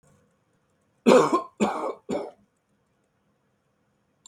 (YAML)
three_cough_length: 4.3 s
three_cough_amplitude: 22472
three_cough_signal_mean_std_ratio: 0.3
survey_phase: beta (2021-08-13 to 2022-03-07)
age: 65+
gender: Male
wearing_mask: 'No'
symptom_none: true
smoker_status: Never smoked
respiratory_condition_asthma: false
respiratory_condition_other: false
recruitment_source: REACT
submission_delay: 2 days
covid_test_result: Negative
covid_test_method: RT-qPCR
influenza_a_test_result: Negative
influenza_b_test_result: Negative